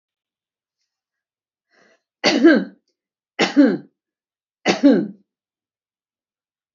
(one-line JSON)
{"three_cough_length": "6.7 s", "three_cough_amplitude": 27615, "three_cough_signal_mean_std_ratio": 0.31, "survey_phase": "alpha (2021-03-01 to 2021-08-12)", "age": "65+", "gender": "Female", "wearing_mask": "No", "symptom_none": true, "smoker_status": "Never smoked", "respiratory_condition_asthma": false, "respiratory_condition_other": false, "recruitment_source": "REACT", "submission_delay": "1 day", "covid_test_result": "Negative", "covid_test_method": "RT-qPCR"}